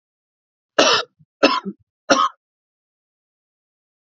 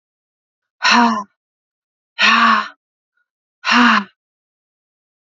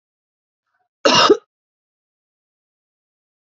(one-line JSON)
{"three_cough_length": "4.2 s", "three_cough_amplitude": 32767, "three_cough_signal_mean_std_ratio": 0.29, "exhalation_length": "5.3 s", "exhalation_amplitude": 31855, "exhalation_signal_mean_std_ratio": 0.4, "cough_length": "3.4 s", "cough_amplitude": 30716, "cough_signal_mean_std_ratio": 0.23, "survey_phase": "beta (2021-08-13 to 2022-03-07)", "age": "18-44", "gender": "Female", "wearing_mask": "No", "symptom_cough_any": true, "symptom_runny_or_blocked_nose": true, "symptom_change_to_sense_of_smell_or_taste": true, "symptom_loss_of_taste": true, "symptom_onset": "4 days", "smoker_status": "Never smoked", "respiratory_condition_asthma": false, "respiratory_condition_other": false, "recruitment_source": "Test and Trace", "submission_delay": "2 days", "covid_test_result": "Positive", "covid_test_method": "RT-qPCR", "covid_ct_value": 18.9, "covid_ct_gene": "ORF1ab gene"}